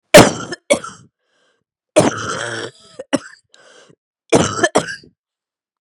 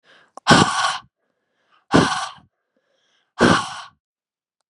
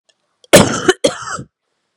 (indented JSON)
{
  "three_cough_length": "5.8 s",
  "three_cough_amplitude": 32768,
  "three_cough_signal_mean_std_ratio": 0.33,
  "exhalation_length": "4.7 s",
  "exhalation_amplitude": 32768,
  "exhalation_signal_mean_std_ratio": 0.36,
  "cough_length": "2.0 s",
  "cough_amplitude": 32768,
  "cough_signal_mean_std_ratio": 0.37,
  "survey_phase": "beta (2021-08-13 to 2022-03-07)",
  "age": "45-64",
  "gender": "Female",
  "wearing_mask": "No",
  "symptom_cough_any": true,
  "symptom_runny_or_blocked_nose": true,
  "symptom_sore_throat": true,
  "symptom_fatigue": true,
  "symptom_headache": true,
  "smoker_status": "Never smoked",
  "respiratory_condition_asthma": false,
  "respiratory_condition_other": false,
  "recruitment_source": "REACT",
  "submission_delay": "1 day",
  "covid_test_result": "Negative",
  "covid_test_method": "RT-qPCR",
  "influenza_a_test_result": "Negative",
  "influenza_b_test_result": "Negative"
}